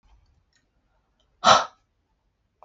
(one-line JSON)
{"exhalation_length": "2.6 s", "exhalation_amplitude": 29885, "exhalation_signal_mean_std_ratio": 0.21, "survey_phase": "beta (2021-08-13 to 2022-03-07)", "age": "45-64", "gender": "Male", "wearing_mask": "No", "symptom_sore_throat": true, "symptom_abdominal_pain": true, "symptom_fatigue": true, "symptom_onset": "12 days", "smoker_status": "Never smoked", "respiratory_condition_asthma": false, "respiratory_condition_other": false, "recruitment_source": "REACT", "submission_delay": "0 days", "covid_test_result": "Negative", "covid_test_method": "RT-qPCR"}